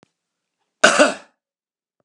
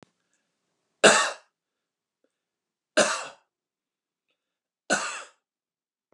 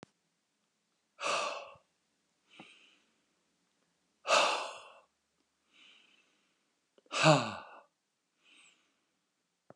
cough_length: 2.0 s
cough_amplitude: 32768
cough_signal_mean_std_ratio: 0.27
three_cough_length: 6.1 s
three_cough_amplitude: 29300
three_cough_signal_mean_std_ratio: 0.24
exhalation_length: 9.8 s
exhalation_amplitude: 9399
exhalation_signal_mean_std_ratio: 0.26
survey_phase: beta (2021-08-13 to 2022-03-07)
age: 45-64
gender: Male
wearing_mask: 'No'
symptom_none: true
smoker_status: Never smoked
respiratory_condition_asthma: false
respiratory_condition_other: false
recruitment_source: REACT
submission_delay: 1 day
covid_test_result: Negative
covid_test_method: RT-qPCR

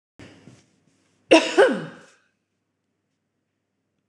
cough_length: 4.1 s
cough_amplitude: 26027
cough_signal_mean_std_ratio: 0.24
survey_phase: alpha (2021-03-01 to 2021-08-12)
age: 45-64
gender: Female
wearing_mask: 'Yes'
symptom_none: true
smoker_status: Current smoker (1 to 10 cigarettes per day)
respiratory_condition_asthma: false
respiratory_condition_other: false
recruitment_source: REACT
submission_delay: 3 days
covid_test_result: Negative
covid_test_method: RT-qPCR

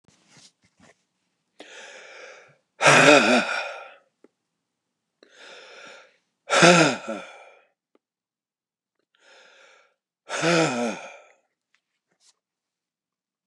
exhalation_length: 13.5 s
exhalation_amplitude: 29113
exhalation_signal_mean_std_ratio: 0.29
survey_phase: beta (2021-08-13 to 2022-03-07)
age: 65+
gender: Male
wearing_mask: 'No'
symptom_runny_or_blocked_nose: true
smoker_status: Ex-smoker
respiratory_condition_asthma: false
respiratory_condition_other: false
recruitment_source: REACT
submission_delay: 1 day
covid_test_result: Negative
covid_test_method: RT-qPCR
influenza_a_test_result: Negative
influenza_b_test_result: Negative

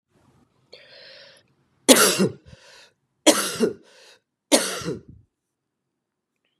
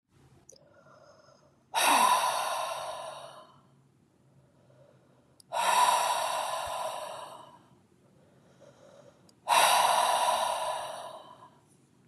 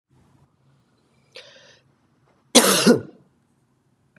three_cough_length: 6.6 s
three_cough_amplitude: 32767
three_cough_signal_mean_std_ratio: 0.3
exhalation_length: 12.1 s
exhalation_amplitude: 10344
exhalation_signal_mean_std_ratio: 0.51
cough_length: 4.2 s
cough_amplitude: 32767
cough_signal_mean_std_ratio: 0.25
survey_phase: beta (2021-08-13 to 2022-03-07)
age: 45-64
gender: Male
wearing_mask: 'No'
symptom_runny_or_blocked_nose: true
symptom_fatigue: true
symptom_onset: 4 days
smoker_status: Never smoked
respiratory_condition_asthma: false
respiratory_condition_other: false
recruitment_source: Test and Trace
submission_delay: 1 day
covid_test_result: Positive
covid_test_method: RT-qPCR
covid_ct_value: 22.5
covid_ct_gene: N gene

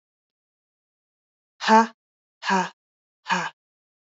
exhalation_length: 4.2 s
exhalation_amplitude: 22517
exhalation_signal_mean_std_ratio: 0.27
survey_phase: beta (2021-08-13 to 2022-03-07)
age: 18-44
gender: Female
wearing_mask: 'No'
symptom_none: true
symptom_onset: 4 days
smoker_status: Never smoked
respiratory_condition_asthma: false
respiratory_condition_other: false
recruitment_source: Test and Trace
submission_delay: 2 days
covid_test_result: Positive
covid_test_method: RT-qPCR
covid_ct_value: 20.6
covid_ct_gene: N gene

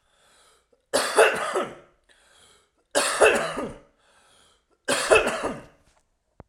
three_cough_length: 6.5 s
three_cough_amplitude: 21556
three_cough_signal_mean_std_ratio: 0.41
survey_phase: alpha (2021-03-01 to 2021-08-12)
age: 18-44
gender: Male
wearing_mask: 'No'
symptom_none: true
smoker_status: Ex-smoker
respiratory_condition_asthma: false
respiratory_condition_other: false
recruitment_source: REACT
submission_delay: 1 day
covid_test_result: Negative
covid_test_method: RT-qPCR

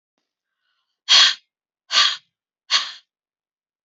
exhalation_length: 3.8 s
exhalation_amplitude: 29386
exhalation_signal_mean_std_ratio: 0.31
survey_phase: alpha (2021-03-01 to 2021-08-12)
age: 45-64
gender: Female
wearing_mask: 'No'
symptom_none: true
smoker_status: Current smoker (1 to 10 cigarettes per day)
respiratory_condition_asthma: true
respiratory_condition_other: false
recruitment_source: REACT
submission_delay: 1 day
covid_test_result: Negative
covid_test_method: RT-qPCR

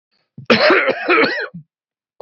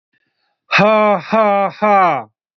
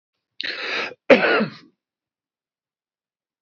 three_cough_length: 2.2 s
three_cough_amplitude: 28033
three_cough_signal_mean_std_ratio: 0.53
exhalation_length: 2.6 s
exhalation_amplitude: 29858
exhalation_signal_mean_std_ratio: 0.6
cough_length: 3.4 s
cough_amplitude: 27048
cough_signal_mean_std_ratio: 0.31
survey_phase: beta (2021-08-13 to 2022-03-07)
age: 18-44
gender: Male
wearing_mask: 'No'
symptom_none: true
smoker_status: Ex-smoker
respiratory_condition_asthma: false
respiratory_condition_other: false
recruitment_source: REACT
submission_delay: 0 days
covid_test_result: Negative
covid_test_method: RT-qPCR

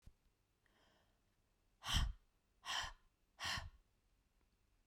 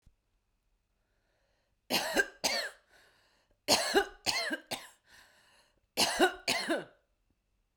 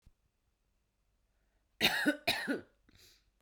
exhalation_length: 4.9 s
exhalation_amplitude: 1731
exhalation_signal_mean_std_ratio: 0.33
three_cough_length: 7.8 s
three_cough_amplitude: 8691
three_cough_signal_mean_std_ratio: 0.39
cough_length: 3.4 s
cough_amplitude: 8600
cough_signal_mean_std_ratio: 0.33
survey_phase: beta (2021-08-13 to 2022-03-07)
age: 18-44
gender: Female
wearing_mask: 'No'
symptom_cough_any: true
symptom_runny_or_blocked_nose: true
symptom_diarrhoea: true
symptom_fatigue: true
symptom_headache: true
symptom_change_to_sense_of_smell_or_taste: true
symptom_loss_of_taste: true
symptom_onset: 5 days
smoker_status: Current smoker (1 to 10 cigarettes per day)
respiratory_condition_asthma: false
respiratory_condition_other: false
recruitment_source: Test and Trace
submission_delay: 2 days
covid_test_result: Positive
covid_test_method: RT-qPCR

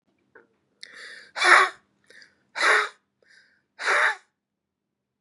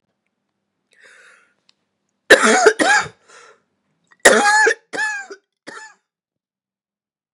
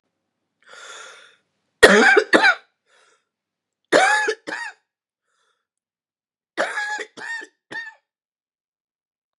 exhalation_length: 5.2 s
exhalation_amplitude: 27270
exhalation_signal_mean_std_ratio: 0.33
cough_length: 7.3 s
cough_amplitude: 32768
cough_signal_mean_std_ratio: 0.34
three_cough_length: 9.4 s
three_cough_amplitude: 32768
three_cough_signal_mean_std_ratio: 0.31
survey_phase: beta (2021-08-13 to 2022-03-07)
age: 45-64
gender: Female
wearing_mask: 'No'
symptom_cough_any: true
symptom_runny_or_blocked_nose: true
symptom_shortness_of_breath: true
smoker_status: Prefer not to say
respiratory_condition_asthma: true
respiratory_condition_other: false
recruitment_source: Test and Trace
submission_delay: 2 days
covid_test_result: Positive
covid_test_method: RT-qPCR
covid_ct_value: 23.1
covid_ct_gene: N gene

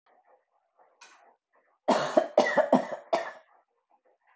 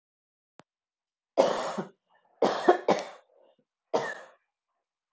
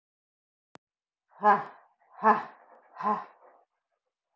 cough_length: 4.4 s
cough_amplitude: 15570
cough_signal_mean_std_ratio: 0.34
three_cough_length: 5.1 s
three_cough_amplitude: 17468
three_cough_signal_mean_std_ratio: 0.32
exhalation_length: 4.4 s
exhalation_amplitude: 11042
exhalation_signal_mean_std_ratio: 0.28
survey_phase: beta (2021-08-13 to 2022-03-07)
age: 45-64
gender: Female
wearing_mask: 'No'
symptom_cough_any: true
symptom_shortness_of_breath: true
symptom_sore_throat: true
smoker_status: Ex-smoker
respiratory_condition_asthma: false
respiratory_condition_other: false
recruitment_source: Test and Trace
submission_delay: 1 day
covid_test_result: Positive
covid_test_method: RT-qPCR
covid_ct_value: 24.1
covid_ct_gene: ORF1ab gene
covid_ct_mean: 24.4
covid_viral_load: 9600 copies/ml
covid_viral_load_category: Minimal viral load (< 10K copies/ml)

